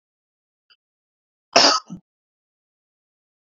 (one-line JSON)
{"cough_length": "3.4 s", "cough_amplitude": 28145, "cough_signal_mean_std_ratio": 0.21, "survey_phase": "beta (2021-08-13 to 2022-03-07)", "age": "18-44", "gender": "Male", "wearing_mask": "No", "symptom_none": true, "smoker_status": "Ex-smoker", "respiratory_condition_asthma": false, "respiratory_condition_other": false, "recruitment_source": "REACT", "submission_delay": "4 days", "covid_test_result": "Negative", "covid_test_method": "RT-qPCR", "influenza_a_test_result": "Negative", "influenza_b_test_result": "Negative"}